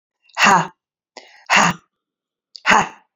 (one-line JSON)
{"exhalation_length": "3.2 s", "exhalation_amplitude": 32768, "exhalation_signal_mean_std_ratio": 0.38, "survey_phase": "beta (2021-08-13 to 2022-03-07)", "age": "18-44", "gender": "Female", "wearing_mask": "No", "symptom_none": true, "symptom_onset": "3 days", "smoker_status": "Never smoked", "respiratory_condition_asthma": false, "respiratory_condition_other": false, "recruitment_source": "REACT", "submission_delay": "1 day", "covid_test_result": "Negative", "covid_test_method": "RT-qPCR"}